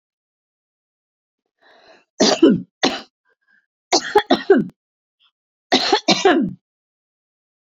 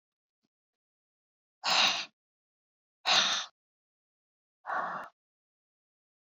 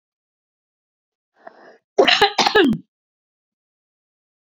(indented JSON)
{
  "three_cough_length": "7.7 s",
  "three_cough_amplitude": 31349,
  "three_cough_signal_mean_std_ratio": 0.35,
  "exhalation_length": "6.4 s",
  "exhalation_amplitude": 8788,
  "exhalation_signal_mean_std_ratio": 0.31,
  "cough_length": "4.5 s",
  "cough_amplitude": 29691,
  "cough_signal_mean_std_ratio": 0.3,
  "survey_phase": "beta (2021-08-13 to 2022-03-07)",
  "age": "45-64",
  "gender": "Female",
  "wearing_mask": "No",
  "symptom_none": true,
  "smoker_status": "Current smoker (1 to 10 cigarettes per day)",
  "respiratory_condition_asthma": true,
  "respiratory_condition_other": false,
  "recruitment_source": "Test and Trace",
  "submission_delay": "2 days",
  "covid_test_result": "Positive",
  "covid_test_method": "RT-qPCR",
  "covid_ct_value": 37.9,
  "covid_ct_gene": "ORF1ab gene"
}